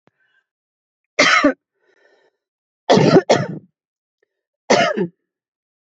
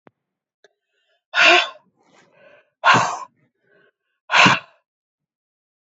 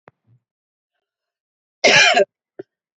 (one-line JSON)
{"three_cough_length": "5.8 s", "three_cough_amplitude": 32767, "three_cough_signal_mean_std_ratio": 0.36, "exhalation_length": "5.8 s", "exhalation_amplitude": 30824, "exhalation_signal_mean_std_ratio": 0.31, "cough_length": "3.0 s", "cough_amplitude": 29398, "cough_signal_mean_std_ratio": 0.3, "survey_phase": "beta (2021-08-13 to 2022-03-07)", "age": "45-64", "gender": "Female", "wearing_mask": "No", "symptom_none": true, "smoker_status": "Never smoked", "respiratory_condition_asthma": false, "respiratory_condition_other": false, "recruitment_source": "REACT", "submission_delay": "4 days", "covid_test_result": "Negative", "covid_test_method": "RT-qPCR", "influenza_a_test_result": "Negative", "influenza_b_test_result": "Negative"}